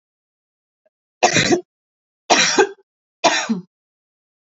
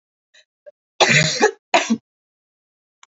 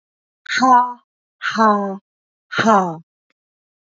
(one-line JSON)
{"three_cough_length": "4.4 s", "three_cough_amplitude": 30357, "three_cough_signal_mean_std_ratio": 0.38, "cough_length": "3.1 s", "cough_amplitude": 31255, "cough_signal_mean_std_ratio": 0.36, "exhalation_length": "3.8 s", "exhalation_amplitude": 26317, "exhalation_signal_mean_std_ratio": 0.47, "survey_phase": "beta (2021-08-13 to 2022-03-07)", "age": "18-44", "gender": "Female", "wearing_mask": "No", "symptom_cough_any": true, "symptom_runny_or_blocked_nose": true, "symptom_fatigue": true, "smoker_status": "Never smoked", "respiratory_condition_asthma": false, "respiratory_condition_other": false, "recruitment_source": "Test and Trace", "submission_delay": "1 day", "covid_test_result": "Positive", "covid_test_method": "LFT"}